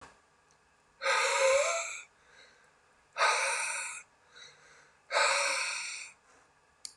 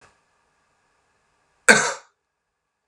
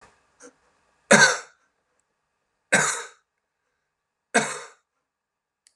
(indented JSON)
{
  "exhalation_length": "7.0 s",
  "exhalation_amplitude": 7022,
  "exhalation_signal_mean_std_ratio": 0.52,
  "cough_length": "2.9 s",
  "cough_amplitude": 32768,
  "cough_signal_mean_std_ratio": 0.19,
  "three_cough_length": "5.8 s",
  "three_cough_amplitude": 32767,
  "three_cough_signal_mean_std_ratio": 0.25,
  "survey_phase": "beta (2021-08-13 to 2022-03-07)",
  "age": "45-64",
  "gender": "Male",
  "wearing_mask": "No",
  "symptom_cough_any": true,
  "symptom_change_to_sense_of_smell_or_taste": true,
  "symptom_loss_of_taste": true,
  "symptom_onset": "2 days",
  "smoker_status": "Ex-smoker",
  "respiratory_condition_asthma": false,
  "respiratory_condition_other": false,
  "recruitment_source": "Test and Trace",
  "submission_delay": "1 day",
  "covid_test_result": "Positive",
  "covid_test_method": "ePCR"
}